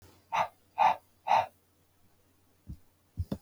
{
  "exhalation_length": "3.4 s",
  "exhalation_amplitude": 6954,
  "exhalation_signal_mean_std_ratio": 0.34,
  "survey_phase": "beta (2021-08-13 to 2022-03-07)",
  "age": "18-44",
  "gender": "Male",
  "wearing_mask": "No",
  "symptom_cough_any": true,
  "symptom_runny_or_blocked_nose": true,
  "symptom_sore_throat": true,
  "symptom_change_to_sense_of_smell_or_taste": true,
  "symptom_other": true,
  "symptom_onset": "5 days",
  "smoker_status": "Never smoked",
  "respiratory_condition_asthma": false,
  "respiratory_condition_other": false,
  "recruitment_source": "Test and Trace",
  "submission_delay": "2 days",
  "covid_test_result": "Positive",
  "covid_test_method": "RT-qPCR",
  "covid_ct_value": 19.5,
  "covid_ct_gene": "N gene"
}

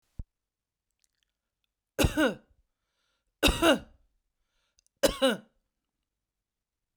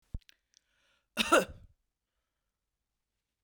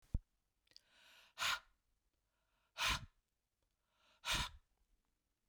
{
  "three_cough_length": "7.0 s",
  "three_cough_amplitude": 13625,
  "three_cough_signal_mean_std_ratio": 0.27,
  "cough_length": "3.4 s",
  "cough_amplitude": 9741,
  "cough_signal_mean_std_ratio": 0.2,
  "exhalation_length": "5.5 s",
  "exhalation_amplitude": 2000,
  "exhalation_signal_mean_std_ratio": 0.3,
  "survey_phase": "beta (2021-08-13 to 2022-03-07)",
  "age": "45-64",
  "gender": "Female",
  "wearing_mask": "No",
  "symptom_abdominal_pain": true,
  "symptom_fatigue": true,
  "symptom_headache": true,
  "symptom_onset": "2 days",
  "smoker_status": "Ex-smoker",
  "respiratory_condition_asthma": false,
  "respiratory_condition_other": false,
  "recruitment_source": "Test and Trace",
  "submission_delay": "1 day",
  "covid_test_result": "Positive",
  "covid_test_method": "RT-qPCR",
  "covid_ct_value": 28.5,
  "covid_ct_gene": "ORF1ab gene",
  "covid_ct_mean": 29.3,
  "covid_viral_load": "250 copies/ml",
  "covid_viral_load_category": "Minimal viral load (< 10K copies/ml)"
}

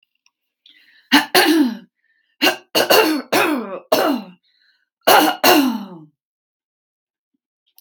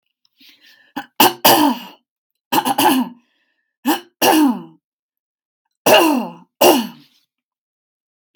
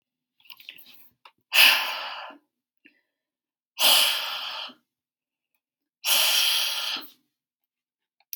{
  "three_cough_length": "7.8 s",
  "three_cough_amplitude": 32768,
  "three_cough_signal_mean_std_ratio": 0.46,
  "cough_length": "8.4 s",
  "cough_amplitude": 32768,
  "cough_signal_mean_std_ratio": 0.41,
  "exhalation_length": "8.4 s",
  "exhalation_amplitude": 24173,
  "exhalation_signal_mean_std_ratio": 0.39,
  "survey_phase": "beta (2021-08-13 to 2022-03-07)",
  "age": "45-64",
  "gender": "Female",
  "wearing_mask": "No",
  "symptom_none": true,
  "smoker_status": "Never smoked",
  "respiratory_condition_asthma": false,
  "respiratory_condition_other": true,
  "recruitment_source": "REACT",
  "submission_delay": "2 days",
  "covid_test_result": "Negative",
  "covid_test_method": "RT-qPCR",
  "influenza_a_test_result": "Negative",
  "influenza_b_test_result": "Negative"
}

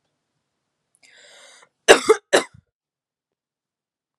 {
  "cough_length": "4.2 s",
  "cough_amplitude": 32768,
  "cough_signal_mean_std_ratio": 0.19,
  "survey_phase": "beta (2021-08-13 to 2022-03-07)",
  "age": "18-44",
  "gender": "Female",
  "wearing_mask": "No",
  "symptom_none": true,
  "smoker_status": "Never smoked",
  "respiratory_condition_asthma": false,
  "respiratory_condition_other": false,
  "recruitment_source": "REACT",
  "submission_delay": "3 days",
  "covid_test_result": "Negative",
  "covid_test_method": "RT-qPCR",
  "influenza_a_test_result": "Negative",
  "influenza_b_test_result": "Negative"
}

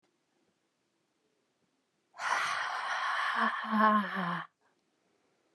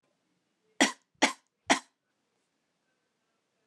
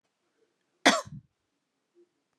{
  "exhalation_length": "5.5 s",
  "exhalation_amplitude": 8755,
  "exhalation_signal_mean_std_ratio": 0.51,
  "three_cough_length": "3.7 s",
  "three_cough_amplitude": 15238,
  "three_cough_signal_mean_std_ratio": 0.2,
  "cough_length": "2.4 s",
  "cough_amplitude": 21957,
  "cough_signal_mean_std_ratio": 0.19,
  "survey_phase": "beta (2021-08-13 to 2022-03-07)",
  "age": "45-64",
  "gender": "Female",
  "wearing_mask": "No",
  "symptom_none": true,
  "smoker_status": "Ex-smoker",
  "respiratory_condition_asthma": false,
  "respiratory_condition_other": false,
  "recruitment_source": "REACT",
  "submission_delay": "1 day",
  "covid_test_result": "Negative",
  "covid_test_method": "RT-qPCR",
  "influenza_a_test_result": "Negative",
  "influenza_b_test_result": "Negative"
}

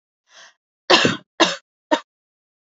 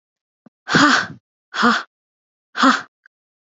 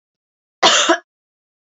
{
  "three_cough_length": "2.7 s",
  "three_cough_amplitude": 30208,
  "three_cough_signal_mean_std_ratio": 0.3,
  "exhalation_length": "3.4 s",
  "exhalation_amplitude": 30973,
  "exhalation_signal_mean_std_ratio": 0.39,
  "cough_length": "1.6 s",
  "cough_amplitude": 29397,
  "cough_signal_mean_std_ratio": 0.36,
  "survey_phase": "beta (2021-08-13 to 2022-03-07)",
  "age": "18-44",
  "gender": "Female",
  "wearing_mask": "No",
  "symptom_none": true,
  "smoker_status": "Ex-smoker",
  "respiratory_condition_asthma": false,
  "respiratory_condition_other": false,
  "recruitment_source": "REACT",
  "submission_delay": "2 days",
  "covid_test_result": "Negative",
  "covid_test_method": "RT-qPCR",
  "influenza_a_test_result": "Negative",
  "influenza_b_test_result": "Negative"
}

